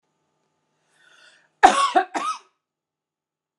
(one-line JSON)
{"cough_length": "3.6 s", "cough_amplitude": 32767, "cough_signal_mean_std_ratio": 0.26, "survey_phase": "beta (2021-08-13 to 2022-03-07)", "age": "45-64", "gender": "Female", "wearing_mask": "No", "symptom_none": true, "smoker_status": "Never smoked", "respiratory_condition_asthma": false, "respiratory_condition_other": false, "recruitment_source": "REACT", "submission_delay": "1 day", "covid_test_result": "Negative", "covid_test_method": "RT-qPCR", "influenza_a_test_result": "Negative", "influenza_b_test_result": "Negative"}